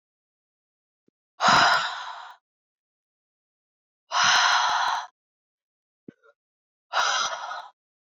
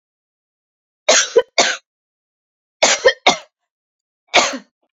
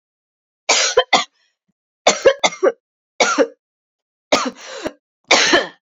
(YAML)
exhalation_length: 8.1 s
exhalation_amplitude: 19725
exhalation_signal_mean_std_ratio: 0.41
three_cough_length: 4.9 s
three_cough_amplitude: 31116
three_cough_signal_mean_std_ratio: 0.34
cough_length: 6.0 s
cough_amplitude: 32768
cough_signal_mean_std_ratio: 0.41
survey_phase: beta (2021-08-13 to 2022-03-07)
age: 18-44
gender: Female
wearing_mask: 'No'
symptom_cough_any: true
symptom_runny_or_blocked_nose: true
symptom_fatigue: true
symptom_fever_high_temperature: true
symptom_headache: true
smoker_status: Never smoked
respiratory_condition_asthma: false
respiratory_condition_other: false
recruitment_source: Test and Trace
submission_delay: 2 days
covid_test_result: Positive
covid_test_method: LFT